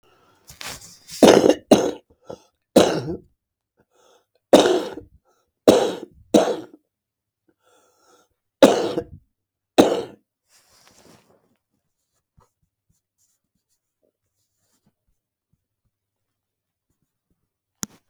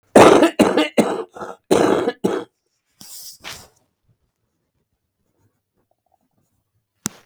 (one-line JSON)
{"three_cough_length": "18.1 s", "three_cough_amplitude": 32768, "three_cough_signal_mean_std_ratio": 0.25, "cough_length": "7.3 s", "cough_amplitude": 32768, "cough_signal_mean_std_ratio": 0.33, "survey_phase": "beta (2021-08-13 to 2022-03-07)", "age": "65+", "gender": "Male", "wearing_mask": "No", "symptom_cough_any": true, "symptom_runny_or_blocked_nose": true, "symptom_fatigue": true, "smoker_status": "Never smoked", "respiratory_condition_asthma": true, "respiratory_condition_other": false, "recruitment_source": "REACT", "submission_delay": "1 day", "covid_test_result": "Negative", "covid_test_method": "RT-qPCR", "influenza_a_test_result": "Negative", "influenza_b_test_result": "Negative"}